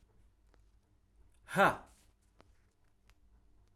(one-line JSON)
{"exhalation_length": "3.8 s", "exhalation_amplitude": 6639, "exhalation_signal_mean_std_ratio": 0.21, "survey_phase": "alpha (2021-03-01 to 2021-08-12)", "age": "18-44", "gender": "Male", "wearing_mask": "No", "symptom_none": true, "smoker_status": "Current smoker (e-cigarettes or vapes only)", "respiratory_condition_asthma": false, "respiratory_condition_other": false, "recruitment_source": "REACT", "submission_delay": "2 days", "covid_test_result": "Negative", "covid_test_method": "RT-qPCR"}